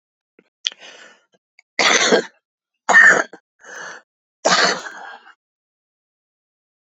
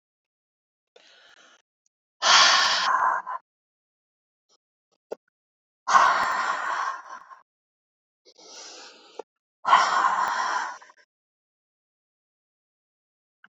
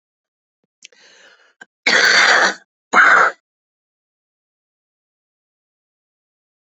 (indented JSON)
{
  "three_cough_length": "6.9 s",
  "three_cough_amplitude": 28651,
  "three_cough_signal_mean_std_ratio": 0.33,
  "exhalation_length": "13.5 s",
  "exhalation_amplitude": 22519,
  "exhalation_signal_mean_std_ratio": 0.38,
  "cough_length": "6.7 s",
  "cough_amplitude": 30674,
  "cough_signal_mean_std_ratio": 0.33,
  "survey_phase": "beta (2021-08-13 to 2022-03-07)",
  "age": "65+",
  "gender": "Female",
  "wearing_mask": "No",
  "symptom_none": true,
  "smoker_status": "Current smoker (1 to 10 cigarettes per day)",
  "respiratory_condition_asthma": false,
  "respiratory_condition_other": false,
  "recruitment_source": "REACT",
  "submission_delay": "6 days",
  "covid_test_result": "Negative",
  "covid_test_method": "RT-qPCR"
}